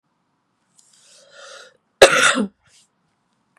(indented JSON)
{
  "cough_length": "3.6 s",
  "cough_amplitude": 32768,
  "cough_signal_mean_std_ratio": 0.25,
  "survey_phase": "beta (2021-08-13 to 2022-03-07)",
  "age": "18-44",
  "gender": "Female",
  "wearing_mask": "No",
  "symptom_cough_any": true,
  "symptom_new_continuous_cough": true,
  "symptom_runny_or_blocked_nose": true,
  "symptom_shortness_of_breath": true,
  "symptom_headache": true,
  "symptom_onset": "3 days",
  "smoker_status": "Ex-smoker",
  "respiratory_condition_asthma": false,
  "respiratory_condition_other": false,
  "recruitment_source": "Test and Trace",
  "submission_delay": "2 days",
  "covid_test_result": "Positive",
  "covid_test_method": "RT-qPCR",
  "covid_ct_value": 31.0,
  "covid_ct_gene": "ORF1ab gene"
}